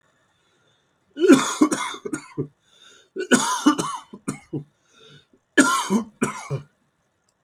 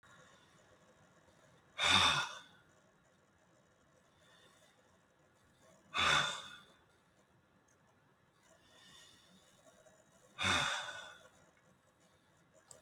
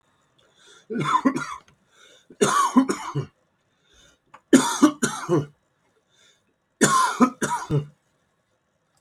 {
  "cough_length": "7.4 s",
  "cough_amplitude": 28669,
  "cough_signal_mean_std_ratio": 0.39,
  "exhalation_length": "12.8 s",
  "exhalation_amplitude": 5271,
  "exhalation_signal_mean_std_ratio": 0.3,
  "three_cough_length": "9.0 s",
  "three_cough_amplitude": 27836,
  "three_cough_signal_mean_std_ratio": 0.41,
  "survey_phase": "alpha (2021-03-01 to 2021-08-12)",
  "age": "45-64",
  "gender": "Male",
  "wearing_mask": "No",
  "symptom_none": true,
  "smoker_status": "Never smoked",
  "respiratory_condition_asthma": true,
  "respiratory_condition_other": false,
  "recruitment_source": "REACT",
  "submission_delay": "3 days",
  "covid_test_result": "Negative",
  "covid_test_method": "RT-qPCR"
}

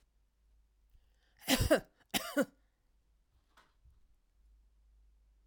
{
  "cough_length": "5.5 s",
  "cough_amplitude": 6647,
  "cough_signal_mean_std_ratio": 0.25,
  "survey_phase": "alpha (2021-03-01 to 2021-08-12)",
  "age": "65+",
  "gender": "Female",
  "wearing_mask": "No",
  "symptom_none": true,
  "smoker_status": "Never smoked",
  "respiratory_condition_asthma": false,
  "respiratory_condition_other": false,
  "recruitment_source": "REACT",
  "submission_delay": "1 day",
  "covid_test_result": "Negative",
  "covid_test_method": "RT-qPCR"
}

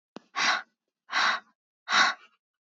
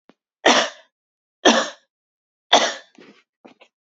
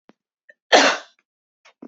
{
  "exhalation_length": "2.7 s",
  "exhalation_amplitude": 12410,
  "exhalation_signal_mean_std_ratio": 0.43,
  "three_cough_length": "3.8 s",
  "three_cough_amplitude": 32768,
  "three_cough_signal_mean_std_ratio": 0.31,
  "cough_length": "1.9 s",
  "cough_amplitude": 28097,
  "cough_signal_mean_std_ratio": 0.28,
  "survey_phase": "beta (2021-08-13 to 2022-03-07)",
  "age": "18-44",
  "gender": "Female",
  "wearing_mask": "No",
  "symptom_cough_any": true,
  "symptom_fatigue": true,
  "symptom_headache": true,
  "symptom_other": true,
  "symptom_onset": "5 days",
  "smoker_status": "Never smoked",
  "respiratory_condition_asthma": false,
  "respiratory_condition_other": false,
  "recruitment_source": "REACT",
  "submission_delay": "2 days",
  "covid_test_result": "Negative",
  "covid_test_method": "RT-qPCR",
  "covid_ct_value": 40.0,
  "covid_ct_gene": "N gene",
  "influenza_a_test_result": "Negative",
  "influenza_b_test_result": "Negative"
}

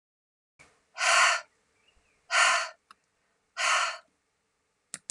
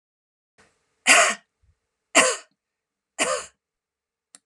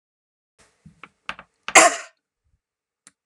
{
  "exhalation_length": "5.1 s",
  "exhalation_amplitude": 10915,
  "exhalation_signal_mean_std_ratio": 0.38,
  "three_cough_length": "4.5 s",
  "three_cough_amplitude": 28905,
  "three_cough_signal_mean_std_ratio": 0.29,
  "cough_length": "3.3 s",
  "cough_amplitude": 32767,
  "cough_signal_mean_std_ratio": 0.19,
  "survey_phase": "alpha (2021-03-01 to 2021-08-12)",
  "age": "45-64",
  "gender": "Female",
  "wearing_mask": "No",
  "symptom_headache": true,
  "smoker_status": "Never smoked",
  "respiratory_condition_asthma": false,
  "respiratory_condition_other": true,
  "recruitment_source": "REACT",
  "submission_delay": "1 day",
  "covid_test_result": "Negative",
  "covid_test_method": "RT-qPCR"
}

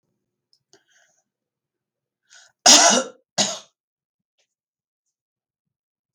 {
  "cough_length": "6.1 s",
  "cough_amplitude": 32768,
  "cough_signal_mean_std_ratio": 0.22,
  "survey_phase": "beta (2021-08-13 to 2022-03-07)",
  "age": "65+",
  "gender": "Female",
  "wearing_mask": "No",
  "symptom_cough_any": true,
  "symptom_onset": "6 days",
  "smoker_status": "Never smoked",
  "respiratory_condition_asthma": false,
  "respiratory_condition_other": false,
  "recruitment_source": "REACT",
  "submission_delay": "5 days",
  "covid_test_result": "Negative",
  "covid_test_method": "RT-qPCR",
  "influenza_a_test_result": "Negative",
  "influenza_b_test_result": "Negative"
}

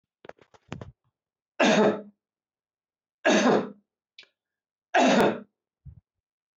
{
  "three_cough_length": "6.6 s",
  "three_cough_amplitude": 12707,
  "three_cough_signal_mean_std_ratio": 0.37,
  "survey_phase": "beta (2021-08-13 to 2022-03-07)",
  "age": "65+",
  "gender": "Male",
  "wearing_mask": "No",
  "symptom_none": true,
  "smoker_status": "Never smoked",
  "respiratory_condition_asthma": false,
  "respiratory_condition_other": false,
  "recruitment_source": "REACT",
  "submission_delay": "3 days",
  "covid_test_result": "Negative",
  "covid_test_method": "RT-qPCR"
}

